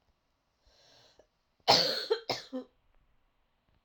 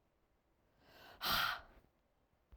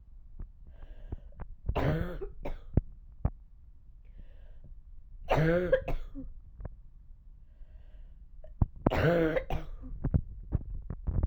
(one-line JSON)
{"cough_length": "3.8 s", "cough_amplitude": 12067, "cough_signal_mean_std_ratio": 0.29, "exhalation_length": "2.6 s", "exhalation_amplitude": 2251, "exhalation_signal_mean_std_ratio": 0.34, "three_cough_length": "11.3 s", "three_cough_amplitude": 15727, "three_cough_signal_mean_std_ratio": 0.55, "survey_phase": "alpha (2021-03-01 to 2021-08-12)", "age": "18-44", "gender": "Female", "wearing_mask": "No", "symptom_cough_any": true, "symptom_new_continuous_cough": true, "symptom_shortness_of_breath": true, "symptom_abdominal_pain": true, "symptom_diarrhoea": true, "symptom_fatigue": true, "symptom_fever_high_temperature": true, "symptom_headache": true, "symptom_change_to_sense_of_smell_or_taste": true, "symptom_onset": "4 days", "smoker_status": "Current smoker (1 to 10 cigarettes per day)", "respiratory_condition_asthma": false, "respiratory_condition_other": false, "recruitment_source": "Test and Trace", "submission_delay": "1 day", "covid_test_result": "Positive", "covid_test_method": "RT-qPCR"}